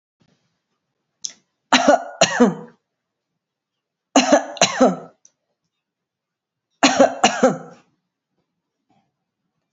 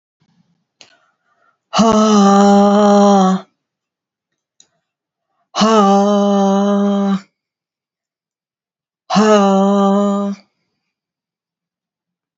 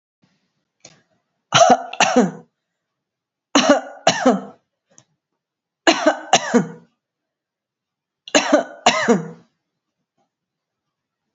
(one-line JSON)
{"three_cough_length": "9.7 s", "three_cough_amplitude": 31178, "three_cough_signal_mean_std_ratio": 0.32, "exhalation_length": "12.4 s", "exhalation_amplitude": 31488, "exhalation_signal_mean_std_ratio": 0.53, "cough_length": "11.3 s", "cough_amplitude": 32768, "cough_signal_mean_std_ratio": 0.34, "survey_phase": "alpha (2021-03-01 to 2021-08-12)", "age": "65+", "gender": "Female", "wearing_mask": "No", "symptom_none": true, "smoker_status": "Ex-smoker", "respiratory_condition_asthma": false, "respiratory_condition_other": false, "recruitment_source": "REACT", "submission_delay": "1 day", "covid_test_result": "Negative", "covid_test_method": "RT-qPCR"}